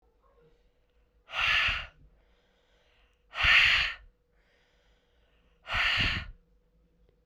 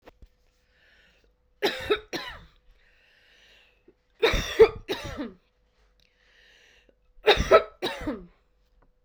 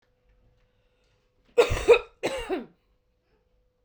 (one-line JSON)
{"exhalation_length": "7.3 s", "exhalation_amplitude": 11226, "exhalation_signal_mean_std_ratio": 0.38, "three_cough_length": "9.0 s", "three_cough_amplitude": 20271, "three_cough_signal_mean_std_ratio": 0.28, "cough_length": "3.8 s", "cough_amplitude": 17980, "cough_signal_mean_std_ratio": 0.28, "survey_phase": "beta (2021-08-13 to 2022-03-07)", "age": "18-44", "gender": "Female", "wearing_mask": "No", "symptom_cough_any": true, "symptom_runny_or_blocked_nose": true, "symptom_shortness_of_breath": true, "symptom_abdominal_pain": true, "symptom_diarrhoea": true, "symptom_fatigue": true, "symptom_change_to_sense_of_smell_or_taste": true, "symptom_loss_of_taste": true, "smoker_status": "Never smoked", "respiratory_condition_asthma": false, "respiratory_condition_other": false, "recruitment_source": "Test and Trace", "submission_delay": "2 days", "covid_test_result": "Positive", "covid_test_method": "RT-qPCR", "covid_ct_value": 21.8, "covid_ct_gene": "ORF1ab gene", "covid_ct_mean": 22.7, "covid_viral_load": "35000 copies/ml", "covid_viral_load_category": "Low viral load (10K-1M copies/ml)"}